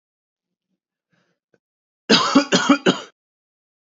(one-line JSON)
{"three_cough_length": "3.9 s", "three_cough_amplitude": 29128, "three_cough_signal_mean_std_ratio": 0.31, "survey_phase": "beta (2021-08-13 to 2022-03-07)", "age": "18-44", "gender": "Male", "wearing_mask": "No", "symptom_cough_any": true, "symptom_sore_throat": true, "symptom_onset": "4 days", "smoker_status": "Never smoked", "respiratory_condition_asthma": false, "respiratory_condition_other": false, "recruitment_source": "Test and Trace", "submission_delay": "1 day", "covid_test_result": "Positive", "covid_test_method": "RT-qPCR", "covid_ct_value": 29.9, "covid_ct_gene": "N gene", "covid_ct_mean": 30.0, "covid_viral_load": "150 copies/ml", "covid_viral_load_category": "Minimal viral load (< 10K copies/ml)"}